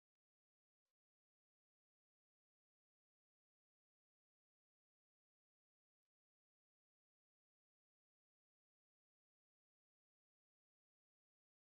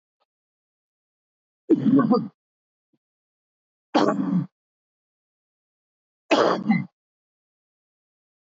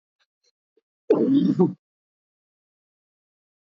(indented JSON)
{
  "exhalation_length": "11.8 s",
  "exhalation_amplitude": 2,
  "exhalation_signal_mean_std_ratio": 0.03,
  "three_cough_length": "8.4 s",
  "three_cough_amplitude": 16318,
  "three_cough_signal_mean_std_ratio": 0.33,
  "cough_length": "3.7 s",
  "cough_amplitude": 15707,
  "cough_signal_mean_std_ratio": 0.33,
  "survey_phase": "alpha (2021-03-01 to 2021-08-12)",
  "age": "65+",
  "gender": "Male",
  "wearing_mask": "No",
  "symptom_cough_any": true,
  "symptom_fatigue": true,
  "symptom_headache": true,
  "symptom_onset": "3 days",
  "smoker_status": "Current smoker (e-cigarettes or vapes only)",
  "respiratory_condition_asthma": false,
  "respiratory_condition_other": false,
  "recruitment_source": "Test and Trace",
  "submission_delay": "1 day",
  "covid_test_result": "Positive",
  "covid_test_method": "RT-qPCR",
  "covid_ct_value": 20.6,
  "covid_ct_gene": "ORF1ab gene",
  "covid_ct_mean": 21.2,
  "covid_viral_load": "110000 copies/ml",
  "covid_viral_load_category": "Low viral load (10K-1M copies/ml)"
}